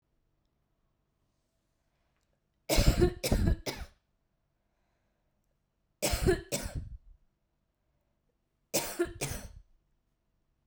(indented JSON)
{
  "three_cough_length": "10.7 s",
  "three_cough_amplitude": 10857,
  "three_cough_signal_mean_std_ratio": 0.32,
  "survey_phase": "beta (2021-08-13 to 2022-03-07)",
  "age": "18-44",
  "gender": "Female",
  "wearing_mask": "No",
  "symptom_cough_any": true,
  "symptom_sore_throat": true,
  "symptom_headache": true,
  "symptom_change_to_sense_of_smell_or_taste": true,
  "symptom_loss_of_taste": true,
  "symptom_onset": "9 days",
  "smoker_status": "Current smoker (e-cigarettes or vapes only)",
  "respiratory_condition_asthma": false,
  "respiratory_condition_other": false,
  "recruitment_source": "Test and Trace",
  "submission_delay": "2 days",
  "covid_test_result": "Positive",
  "covid_test_method": "RT-qPCR",
  "covid_ct_value": 15.6,
  "covid_ct_gene": "ORF1ab gene",
  "covid_ct_mean": 16.1,
  "covid_viral_load": "5300000 copies/ml",
  "covid_viral_load_category": "High viral load (>1M copies/ml)"
}